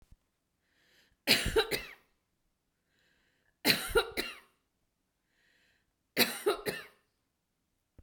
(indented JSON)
{
  "three_cough_length": "8.0 s",
  "three_cough_amplitude": 13899,
  "three_cough_signal_mean_std_ratio": 0.31,
  "survey_phase": "beta (2021-08-13 to 2022-03-07)",
  "age": "45-64",
  "gender": "Female",
  "wearing_mask": "No",
  "symptom_none": true,
  "smoker_status": "Never smoked",
  "respiratory_condition_asthma": false,
  "respiratory_condition_other": false,
  "recruitment_source": "REACT",
  "submission_delay": "2 days",
  "covid_test_result": "Negative",
  "covid_test_method": "RT-qPCR",
  "influenza_a_test_result": "Negative",
  "influenza_b_test_result": "Negative"
}